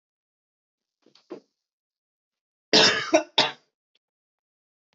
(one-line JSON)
{"cough_length": "4.9 s", "cough_amplitude": 19040, "cough_signal_mean_std_ratio": 0.25, "survey_phase": "beta (2021-08-13 to 2022-03-07)", "age": "18-44", "gender": "Male", "wearing_mask": "No", "symptom_cough_any": true, "symptom_runny_or_blocked_nose": true, "symptom_shortness_of_breath": true, "symptom_fatigue": true, "symptom_headache": true, "symptom_change_to_sense_of_smell_or_taste": true, "symptom_onset": "2 days", "smoker_status": "Never smoked", "respiratory_condition_asthma": false, "respiratory_condition_other": false, "recruitment_source": "Test and Trace", "submission_delay": "2 days", "covid_test_result": "Positive", "covid_test_method": "RT-qPCR", "covid_ct_value": 23.0, "covid_ct_gene": "ORF1ab gene", "covid_ct_mean": 23.4, "covid_viral_load": "22000 copies/ml", "covid_viral_load_category": "Low viral load (10K-1M copies/ml)"}